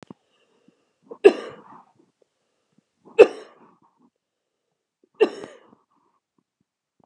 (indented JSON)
{
  "three_cough_length": "7.1 s",
  "three_cough_amplitude": 32768,
  "three_cough_signal_mean_std_ratio": 0.15,
  "survey_phase": "beta (2021-08-13 to 2022-03-07)",
  "age": "65+",
  "gender": "Female",
  "wearing_mask": "No",
  "symptom_none": true,
  "smoker_status": "Never smoked",
  "respiratory_condition_asthma": true,
  "respiratory_condition_other": false,
  "recruitment_source": "REACT",
  "submission_delay": "2 days",
  "covid_test_result": "Negative",
  "covid_test_method": "RT-qPCR"
}